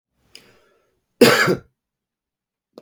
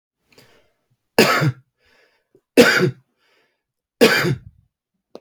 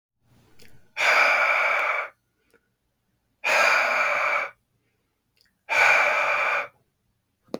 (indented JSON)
{
  "cough_length": "2.8 s",
  "cough_amplitude": 32768,
  "cough_signal_mean_std_ratio": 0.27,
  "three_cough_length": "5.2 s",
  "three_cough_amplitude": 32768,
  "three_cough_signal_mean_std_ratio": 0.34,
  "exhalation_length": "7.6 s",
  "exhalation_amplitude": 18062,
  "exhalation_signal_mean_std_ratio": 0.57,
  "survey_phase": "beta (2021-08-13 to 2022-03-07)",
  "age": "45-64",
  "gender": "Male",
  "wearing_mask": "No",
  "symptom_cough_any": true,
  "symptom_runny_or_blocked_nose": true,
  "symptom_sore_throat": true,
  "symptom_onset": "12 days",
  "smoker_status": "Current smoker (11 or more cigarettes per day)",
  "respiratory_condition_asthma": false,
  "respiratory_condition_other": false,
  "recruitment_source": "REACT",
  "submission_delay": "2 days",
  "covid_test_result": "Negative",
  "covid_test_method": "RT-qPCR",
  "influenza_a_test_result": "Negative",
  "influenza_b_test_result": "Negative"
}